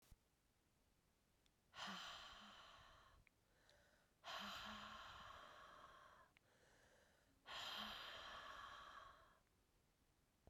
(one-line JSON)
{"exhalation_length": "10.5 s", "exhalation_amplitude": 353, "exhalation_signal_mean_std_ratio": 0.63, "survey_phase": "beta (2021-08-13 to 2022-03-07)", "age": "45-64", "gender": "Female", "wearing_mask": "No", "symptom_cough_any": true, "symptom_runny_or_blocked_nose": true, "symptom_shortness_of_breath": true, "symptom_fatigue": true, "symptom_fever_high_temperature": true, "symptom_headache": true, "symptom_change_to_sense_of_smell_or_taste": true, "symptom_onset": "3 days", "smoker_status": "Ex-smoker", "respiratory_condition_asthma": true, "respiratory_condition_other": false, "recruitment_source": "Test and Trace", "submission_delay": "1 day", "covid_test_result": "Positive", "covid_test_method": "ePCR"}